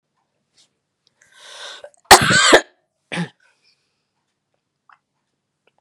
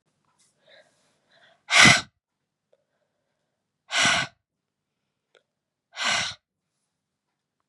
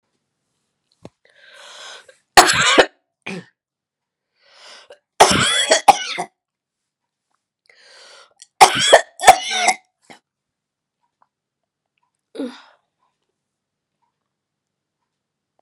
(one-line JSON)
{"cough_length": "5.8 s", "cough_amplitude": 32768, "cough_signal_mean_std_ratio": 0.23, "exhalation_length": "7.7 s", "exhalation_amplitude": 30349, "exhalation_signal_mean_std_ratio": 0.24, "three_cough_length": "15.6 s", "three_cough_amplitude": 32768, "three_cough_signal_mean_std_ratio": 0.26, "survey_phase": "beta (2021-08-13 to 2022-03-07)", "age": "45-64", "gender": "Female", "wearing_mask": "No", "symptom_cough_any": true, "symptom_runny_or_blocked_nose": true, "symptom_sore_throat": true, "symptom_headache": true, "symptom_onset": "3 days", "smoker_status": "Never smoked", "respiratory_condition_asthma": false, "respiratory_condition_other": false, "recruitment_source": "Test and Trace", "submission_delay": "1 day", "covid_test_result": "Positive", "covid_test_method": "ePCR"}